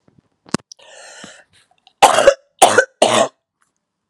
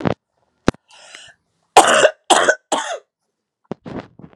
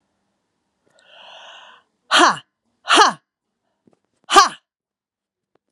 three_cough_length: 4.1 s
three_cough_amplitude: 32768
three_cough_signal_mean_std_ratio: 0.33
cough_length: 4.4 s
cough_amplitude: 32768
cough_signal_mean_std_ratio: 0.34
exhalation_length: 5.7 s
exhalation_amplitude: 32768
exhalation_signal_mean_std_ratio: 0.26
survey_phase: beta (2021-08-13 to 2022-03-07)
age: 65+
gender: Female
wearing_mask: 'No'
symptom_cough_any: true
symptom_new_continuous_cough: true
symptom_runny_or_blocked_nose: true
symptom_sore_throat: true
symptom_fatigue: true
symptom_headache: true
smoker_status: Never smoked
respiratory_condition_asthma: false
respiratory_condition_other: false
recruitment_source: Test and Trace
submission_delay: 1 day
covid_test_result: Positive
covid_test_method: LFT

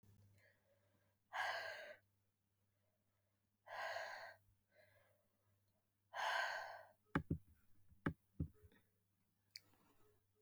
exhalation_length: 10.4 s
exhalation_amplitude: 2083
exhalation_signal_mean_std_ratio: 0.37
survey_phase: beta (2021-08-13 to 2022-03-07)
age: 18-44
gender: Female
wearing_mask: 'No'
symptom_cough_any: true
symptom_runny_or_blocked_nose: true
symptom_shortness_of_breath: true
symptom_sore_throat: true
symptom_fatigue: true
symptom_headache: true
symptom_other: true
smoker_status: Never smoked
respiratory_condition_asthma: false
respiratory_condition_other: false
recruitment_source: Test and Trace
submission_delay: 2 days
covid_test_result: Positive
covid_test_method: RT-qPCR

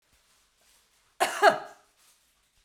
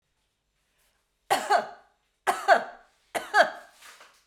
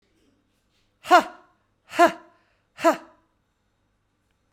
cough_length: 2.6 s
cough_amplitude: 18176
cough_signal_mean_std_ratio: 0.25
three_cough_length: 4.3 s
three_cough_amplitude: 16649
three_cough_signal_mean_std_ratio: 0.33
exhalation_length: 4.5 s
exhalation_amplitude: 25964
exhalation_signal_mean_std_ratio: 0.23
survey_phase: beta (2021-08-13 to 2022-03-07)
age: 45-64
gender: Female
wearing_mask: 'Yes'
symptom_runny_or_blocked_nose: true
symptom_sore_throat: true
symptom_onset: 6 days
smoker_status: Never smoked
respiratory_condition_asthma: false
respiratory_condition_other: false
recruitment_source: Test and Trace
submission_delay: 2 days
covid_test_result: Positive
covid_test_method: RT-qPCR
covid_ct_value: 20.7
covid_ct_gene: ORF1ab gene
covid_ct_mean: 21.6
covid_viral_load: 83000 copies/ml
covid_viral_load_category: Low viral load (10K-1M copies/ml)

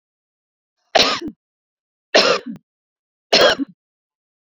three_cough_length: 4.5 s
three_cough_amplitude: 30981
three_cough_signal_mean_std_ratio: 0.33
survey_phase: beta (2021-08-13 to 2022-03-07)
age: 65+
gender: Female
wearing_mask: 'No'
symptom_none: true
smoker_status: Never smoked
respiratory_condition_asthma: false
respiratory_condition_other: false
recruitment_source: REACT
submission_delay: 2 days
covid_test_result: Negative
covid_test_method: RT-qPCR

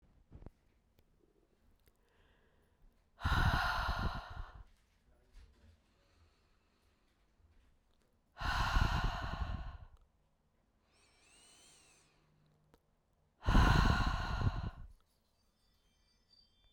exhalation_length: 16.7 s
exhalation_amplitude: 4713
exhalation_signal_mean_std_ratio: 0.37
survey_phase: beta (2021-08-13 to 2022-03-07)
age: 18-44
gender: Female
wearing_mask: 'No'
symptom_cough_any: true
symptom_runny_or_blocked_nose: true
symptom_sore_throat: true
symptom_fatigue: true
symptom_headache: true
symptom_change_to_sense_of_smell_or_taste: true
smoker_status: Never smoked
respiratory_condition_asthma: false
respiratory_condition_other: false
recruitment_source: Test and Trace
submission_delay: 2 days
covid_test_result: Positive
covid_test_method: RT-qPCR
covid_ct_value: 15.1
covid_ct_gene: ORF1ab gene
covid_ct_mean: 15.5
covid_viral_load: 8100000 copies/ml
covid_viral_load_category: High viral load (>1M copies/ml)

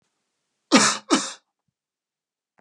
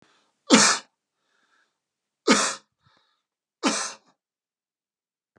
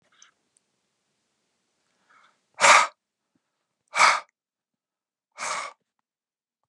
cough_length: 2.6 s
cough_amplitude: 29707
cough_signal_mean_std_ratio: 0.29
three_cough_length: 5.4 s
three_cough_amplitude: 29527
three_cough_signal_mean_std_ratio: 0.27
exhalation_length: 6.7 s
exhalation_amplitude: 26083
exhalation_signal_mean_std_ratio: 0.23
survey_phase: beta (2021-08-13 to 2022-03-07)
age: 65+
gender: Male
wearing_mask: 'No'
symptom_none: true
smoker_status: Never smoked
respiratory_condition_asthma: false
respiratory_condition_other: false
recruitment_source: REACT
submission_delay: 1 day
covid_test_result: Negative
covid_test_method: RT-qPCR
influenza_a_test_result: Negative
influenza_b_test_result: Negative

